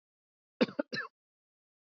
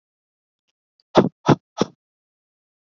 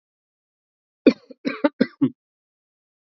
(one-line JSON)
{"cough_length": "2.0 s", "cough_amplitude": 6376, "cough_signal_mean_std_ratio": 0.22, "exhalation_length": "2.8 s", "exhalation_amplitude": 27475, "exhalation_signal_mean_std_ratio": 0.21, "three_cough_length": "3.1 s", "three_cough_amplitude": 27609, "three_cough_signal_mean_std_ratio": 0.22, "survey_phase": "beta (2021-08-13 to 2022-03-07)", "age": "45-64", "gender": "Male", "wearing_mask": "No", "symptom_runny_or_blocked_nose": true, "smoker_status": "Ex-smoker", "respiratory_condition_asthma": false, "respiratory_condition_other": false, "recruitment_source": "REACT", "submission_delay": "3 days", "covid_test_result": "Negative", "covid_test_method": "RT-qPCR", "influenza_a_test_result": "Negative", "influenza_b_test_result": "Negative"}